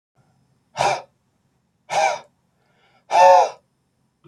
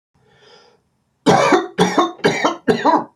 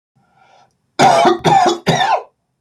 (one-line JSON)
{"exhalation_length": "4.3 s", "exhalation_amplitude": 27294, "exhalation_signal_mean_std_ratio": 0.33, "three_cough_length": "3.2 s", "three_cough_amplitude": 32767, "three_cough_signal_mean_std_ratio": 0.54, "cough_length": "2.6 s", "cough_amplitude": 29553, "cough_signal_mean_std_ratio": 0.57, "survey_phase": "beta (2021-08-13 to 2022-03-07)", "age": "18-44", "gender": "Male", "wearing_mask": "No", "symptom_headache": true, "smoker_status": "Never smoked", "respiratory_condition_asthma": false, "respiratory_condition_other": false, "recruitment_source": "REACT", "submission_delay": "1 day", "covid_test_result": "Negative", "covid_test_method": "RT-qPCR", "influenza_a_test_result": "Negative", "influenza_b_test_result": "Negative"}